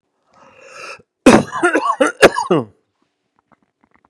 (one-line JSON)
{"three_cough_length": "4.1 s", "three_cough_amplitude": 32768, "three_cough_signal_mean_std_ratio": 0.36, "survey_phase": "beta (2021-08-13 to 2022-03-07)", "age": "45-64", "gender": "Male", "wearing_mask": "No", "symptom_cough_any": true, "symptom_fever_high_temperature": true, "smoker_status": "Ex-smoker", "respiratory_condition_asthma": false, "respiratory_condition_other": false, "recruitment_source": "Test and Trace", "submission_delay": "1 day", "covid_test_result": "Negative", "covid_test_method": "RT-qPCR"}